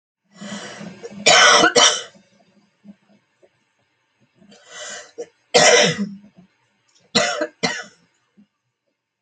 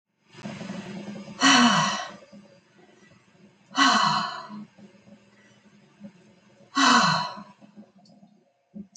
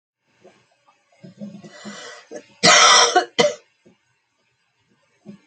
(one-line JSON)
{"three_cough_length": "9.2 s", "three_cough_amplitude": 32355, "three_cough_signal_mean_std_ratio": 0.35, "exhalation_length": "9.0 s", "exhalation_amplitude": 18176, "exhalation_signal_mean_std_ratio": 0.41, "cough_length": "5.5 s", "cough_amplitude": 32767, "cough_signal_mean_std_ratio": 0.32, "survey_phase": "alpha (2021-03-01 to 2021-08-12)", "age": "45-64", "gender": "Female", "wearing_mask": "No", "symptom_cough_any": true, "symptom_new_continuous_cough": true, "symptom_shortness_of_breath": true, "symptom_headache": true, "symptom_change_to_sense_of_smell_or_taste": true, "symptom_loss_of_taste": true, "symptom_onset": "7 days", "smoker_status": "Never smoked", "respiratory_condition_asthma": true, "respiratory_condition_other": true, "recruitment_source": "Test and Trace", "submission_delay": "2 days", "covid_test_result": "Positive", "covid_test_method": "RT-qPCR"}